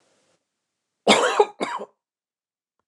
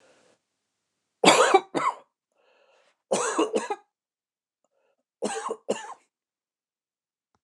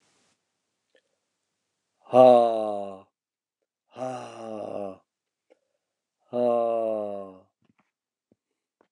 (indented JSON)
{
  "cough_length": "2.9 s",
  "cough_amplitude": 28436,
  "cough_signal_mean_std_ratio": 0.31,
  "three_cough_length": "7.4 s",
  "three_cough_amplitude": 27527,
  "three_cough_signal_mean_std_ratio": 0.31,
  "exhalation_length": "8.9 s",
  "exhalation_amplitude": 20378,
  "exhalation_signal_mean_std_ratio": 0.3,
  "survey_phase": "beta (2021-08-13 to 2022-03-07)",
  "age": "45-64",
  "gender": "Male",
  "wearing_mask": "No",
  "symptom_cough_any": true,
  "symptom_sore_throat": true,
  "symptom_fatigue": true,
  "symptom_headache": true,
  "symptom_change_to_sense_of_smell_or_taste": true,
  "smoker_status": "Never smoked",
  "respiratory_condition_asthma": false,
  "respiratory_condition_other": false,
  "recruitment_source": "Test and Trace",
  "submission_delay": "1 day",
  "covid_test_result": "Positive",
  "covid_test_method": "RT-qPCR",
  "covid_ct_value": 22.9,
  "covid_ct_gene": "S gene",
  "covid_ct_mean": 23.2,
  "covid_viral_load": "25000 copies/ml",
  "covid_viral_load_category": "Low viral load (10K-1M copies/ml)"
}